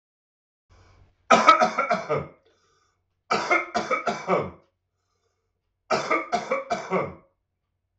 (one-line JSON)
{"three_cough_length": "8.0 s", "three_cough_amplitude": 25445, "three_cough_signal_mean_std_ratio": 0.42, "survey_phase": "beta (2021-08-13 to 2022-03-07)", "age": "45-64", "gender": "Male", "wearing_mask": "No", "symptom_cough_any": true, "symptom_runny_or_blocked_nose": true, "symptom_sore_throat": true, "symptom_onset": "2 days", "smoker_status": "Ex-smoker", "respiratory_condition_asthma": false, "respiratory_condition_other": false, "recruitment_source": "Test and Trace", "submission_delay": "1 day", "covid_test_result": "Negative", "covid_test_method": "ePCR"}